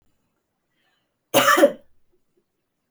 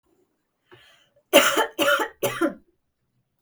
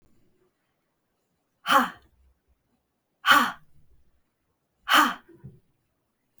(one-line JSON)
{"cough_length": "2.9 s", "cough_amplitude": 26057, "cough_signal_mean_std_ratio": 0.28, "three_cough_length": "3.4 s", "three_cough_amplitude": 32521, "three_cough_signal_mean_std_ratio": 0.38, "exhalation_length": "6.4 s", "exhalation_amplitude": 19997, "exhalation_signal_mean_std_ratio": 0.26, "survey_phase": "beta (2021-08-13 to 2022-03-07)", "age": "18-44", "gender": "Female", "wearing_mask": "No", "symptom_none": true, "smoker_status": "Never smoked", "respiratory_condition_asthma": false, "respiratory_condition_other": false, "recruitment_source": "REACT", "submission_delay": "2 days", "covid_test_result": "Negative", "covid_test_method": "RT-qPCR", "influenza_a_test_result": "Negative", "influenza_b_test_result": "Negative"}